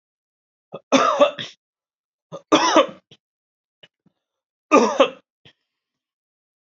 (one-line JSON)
{"three_cough_length": "6.7 s", "three_cough_amplitude": 29103, "three_cough_signal_mean_std_ratio": 0.31, "survey_phase": "beta (2021-08-13 to 2022-03-07)", "age": "45-64", "gender": "Male", "wearing_mask": "No", "symptom_cough_any": true, "symptom_runny_or_blocked_nose": true, "symptom_sore_throat": true, "symptom_fatigue": true, "symptom_headache": true, "symptom_onset": "3 days", "smoker_status": "Never smoked", "respiratory_condition_asthma": false, "respiratory_condition_other": false, "recruitment_source": "Test and Trace", "submission_delay": "1 day", "covid_test_result": "Positive", "covid_test_method": "RT-qPCR", "covid_ct_value": 12.7, "covid_ct_gene": "N gene", "covid_ct_mean": 13.2, "covid_viral_load": "48000000 copies/ml", "covid_viral_load_category": "High viral load (>1M copies/ml)"}